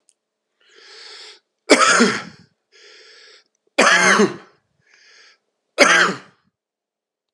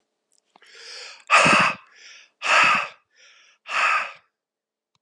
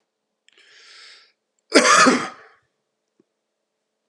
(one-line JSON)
{"three_cough_length": "7.3 s", "three_cough_amplitude": 32768, "three_cough_signal_mean_std_ratio": 0.36, "exhalation_length": "5.0 s", "exhalation_amplitude": 27296, "exhalation_signal_mean_std_ratio": 0.42, "cough_length": "4.1 s", "cough_amplitude": 32768, "cough_signal_mean_std_ratio": 0.29, "survey_phase": "beta (2021-08-13 to 2022-03-07)", "age": "45-64", "gender": "Male", "wearing_mask": "No", "symptom_cough_any": true, "symptom_runny_or_blocked_nose": true, "symptom_onset": "4 days", "smoker_status": "Never smoked", "respiratory_condition_asthma": false, "respiratory_condition_other": false, "recruitment_source": "Test and Trace", "submission_delay": "2 days", "covid_test_result": "Positive", "covid_test_method": "RT-qPCR", "covid_ct_value": 16.5, "covid_ct_gene": "ORF1ab gene", "covid_ct_mean": 16.7, "covid_viral_load": "3400000 copies/ml", "covid_viral_load_category": "High viral load (>1M copies/ml)"}